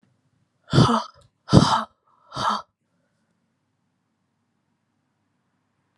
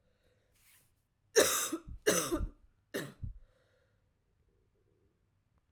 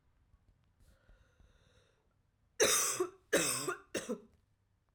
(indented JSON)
{
  "exhalation_length": "6.0 s",
  "exhalation_amplitude": 31427,
  "exhalation_signal_mean_std_ratio": 0.27,
  "three_cough_length": "5.7 s",
  "three_cough_amplitude": 7754,
  "three_cough_signal_mean_std_ratio": 0.32,
  "cough_length": "4.9 s",
  "cough_amplitude": 5506,
  "cough_signal_mean_std_ratio": 0.37,
  "survey_phase": "alpha (2021-03-01 to 2021-08-12)",
  "age": "18-44",
  "gender": "Female",
  "wearing_mask": "No",
  "symptom_cough_any": true,
  "symptom_new_continuous_cough": true,
  "symptom_shortness_of_breath": true,
  "symptom_abdominal_pain": true,
  "symptom_fatigue": true,
  "symptom_headache": true,
  "symptom_change_to_sense_of_smell_or_taste": true,
  "symptom_loss_of_taste": true,
  "symptom_onset": "5 days",
  "smoker_status": "Never smoked",
  "respiratory_condition_asthma": true,
  "respiratory_condition_other": false,
  "recruitment_source": "Test and Trace",
  "submission_delay": "2 days",
  "covid_test_result": "Positive",
  "covid_test_method": "RT-qPCR",
  "covid_ct_value": 14.7,
  "covid_ct_gene": "ORF1ab gene",
  "covid_ct_mean": 15.6,
  "covid_viral_load": "7600000 copies/ml",
  "covid_viral_load_category": "High viral load (>1M copies/ml)"
}